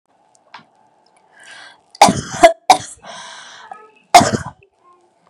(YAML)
cough_length: 5.3 s
cough_amplitude: 32768
cough_signal_mean_std_ratio: 0.27
survey_phase: beta (2021-08-13 to 2022-03-07)
age: 18-44
gender: Female
wearing_mask: 'No'
symptom_none: true
smoker_status: Never smoked
respiratory_condition_asthma: false
respiratory_condition_other: false
recruitment_source: REACT
submission_delay: 3 days
covid_test_result: Negative
covid_test_method: RT-qPCR
influenza_a_test_result: Negative
influenza_b_test_result: Negative